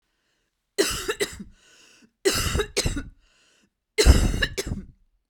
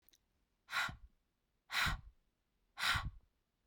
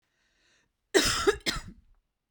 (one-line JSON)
{"three_cough_length": "5.3 s", "three_cough_amplitude": 29502, "three_cough_signal_mean_std_ratio": 0.41, "exhalation_length": "3.7 s", "exhalation_amplitude": 3040, "exhalation_signal_mean_std_ratio": 0.39, "cough_length": "2.3 s", "cough_amplitude": 11802, "cough_signal_mean_std_ratio": 0.36, "survey_phase": "beta (2021-08-13 to 2022-03-07)", "age": "45-64", "gender": "Female", "wearing_mask": "No", "symptom_none": true, "smoker_status": "Ex-smoker", "respiratory_condition_asthma": false, "respiratory_condition_other": false, "recruitment_source": "REACT", "submission_delay": "2 days", "covid_test_result": "Negative", "covid_test_method": "RT-qPCR"}